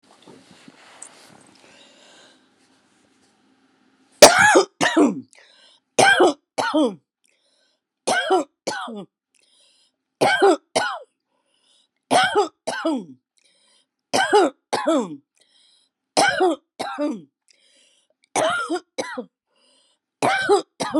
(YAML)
three_cough_length: 21.0 s
three_cough_amplitude: 32768
three_cough_signal_mean_std_ratio: 0.39
survey_phase: beta (2021-08-13 to 2022-03-07)
age: 65+
gender: Female
wearing_mask: 'No'
symptom_none: true
symptom_onset: 13 days
smoker_status: Never smoked
respiratory_condition_asthma: false
respiratory_condition_other: false
recruitment_source: REACT
submission_delay: 7 days
covid_test_result: Negative
covid_test_method: RT-qPCR